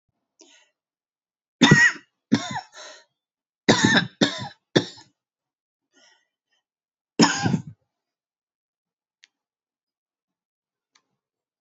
{
  "three_cough_length": "11.6 s",
  "three_cough_amplitude": 26971,
  "three_cough_signal_mean_std_ratio": 0.26,
  "survey_phase": "beta (2021-08-13 to 2022-03-07)",
  "age": "45-64",
  "gender": "Female",
  "wearing_mask": "No",
  "symptom_cough_any": true,
  "symptom_runny_or_blocked_nose": true,
  "symptom_shortness_of_breath": true,
  "symptom_sore_throat": true,
  "symptom_fatigue": true,
  "symptom_fever_high_temperature": true,
  "symptom_headache": true,
  "symptom_change_to_sense_of_smell_or_taste": true,
  "symptom_loss_of_taste": true,
  "symptom_other": true,
  "symptom_onset": "4 days",
  "smoker_status": "Never smoked",
  "respiratory_condition_asthma": false,
  "respiratory_condition_other": false,
  "recruitment_source": "Test and Trace",
  "submission_delay": "2 days",
  "covid_test_result": "Positive",
  "covid_test_method": "RT-qPCR"
}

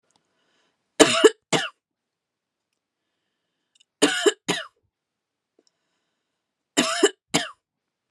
{
  "three_cough_length": "8.1 s",
  "three_cough_amplitude": 32767,
  "three_cough_signal_mean_std_ratio": 0.26,
  "survey_phase": "alpha (2021-03-01 to 2021-08-12)",
  "age": "18-44",
  "gender": "Female",
  "wearing_mask": "No",
  "symptom_none": true,
  "smoker_status": "Never smoked",
  "respiratory_condition_asthma": true,
  "respiratory_condition_other": false,
  "recruitment_source": "REACT",
  "submission_delay": "3 days",
  "covid_test_result": "Negative",
  "covid_test_method": "RT-qPCR"
}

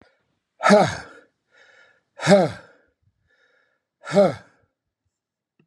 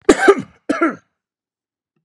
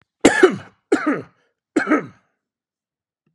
{
  "exhalation_length": "5.7 s",
  "exhalation_amplitude": 27309,
  "exhalation_signal_mean_std_ratio": 0.3,
  "cough_length": "2.0 s",
  "cough_amplitude": 32768,
  "cough_signal_mean_std_ratio": 0.34,
  "three_cough_length": "3.3 s",
  "three_cough_amplitude": 32768,
  "three_cough_signal_mean_std_ratio": 0.35,
  "survey_phase": "beta (2021-08-13 to 2022-03-07)",
  "age": "65+",
  "gender": "Male",
  "wearing_mask": "No",
  "symptom_none": true,
  "smoker_status": "Never smoked",
  "respiratory_condition_asthma": true,
  "respiratory_condition_other": false,
  "recruitment_source": "REACT",
  "submission_delay": "2 days",
  "covid_test_result": "Negative",
  "covid_test_method": "RT-qPCR",
  "influenza_a_test_result": "Negative",
  "influenza_b_test_result": "Negative"
}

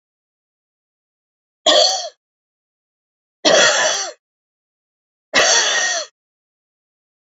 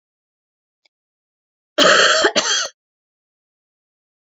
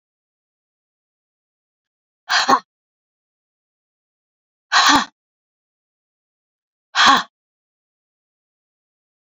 {
  "three_cough_length": "7.3 s",
  "three_cough_amplitude": 31535,
  "three_cough_signal_mean_std_ratio": 0.38,
  "cough_length": "4.3 s",
  "cough_amplitude": 31547,
  "cough_signal_mean_std_ratio": 0.35,
  "exhalation_length": "9.3 s",
  "exhalation_amplitude": 31603,
  "exhalation_signal_mean_std_ratio": 0.23,
  "survey_phase": "beta (2021-08-13 to 2022-03-07)",
  "age": "45-64",
  "gender": "Female",
  "wearing_mask": "No",
  "symptom_runny_or_blocked_nose": true,
  "symptom_shortness_of_breath": true,
  "symptom_fatigue": true,
  "symptom_onset": "12 days",
  "smoker_status": "Never smoked",
  "respiratory_condition_asthma": false,
  "respiratory_condition_other": false,
  "recruitment_source": "REACT",
  "submission_delay": "12 days",
  "covid_test_result": "Negative",
  "covid_test_method": "RT-qPCR",
  "influenza_a_test_result": "Negative",
  "influenza_b_test_result": "Negative"
}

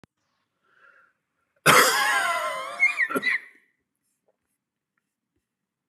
{
  "cough_length": "5.9 s",
  "cough_amplitude": 28438,
  "cough_signal_mean_std_ratio": 0.38,
  "survey_phase": "beta (2021-08-13 to 2022-03-07)",
  "age": "45-64",
  "gender": "Male",
  "wearing_mask": "No",
  "symptom_none": true,
  "smoker_status": "Never smoked",
  "respiratory_condition_asthma": false,
  "respiratory_condition_other": false,
  "recruitment_source": "Test and Trace",
  "submission_delay": "2 days",
  "covid_test_result": "Negative",
  "covid_test_method": "RT-qPCR"
}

